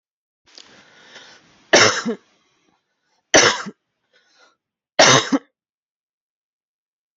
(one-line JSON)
{"three_cough_length": "7.2 s", "three_cough_amplitude": 32768, "three_cough_signal_mean_std_ratio": 0.28, "survey_phase": "beta (2021-08-13 to 2022-03-07)", "age": "45-64", "gender": "Female", "wearing_mask": "No", "symptom_none": true, "smoker_status": "Never smoked", "respiratory_condition_asthma": false, "respiratory_condition_other": false, "recruitment_source": "REACT", "submission_delay": "1 day", "covid_test_result": "Negative", "covid_test_method": "RT-qPCR"}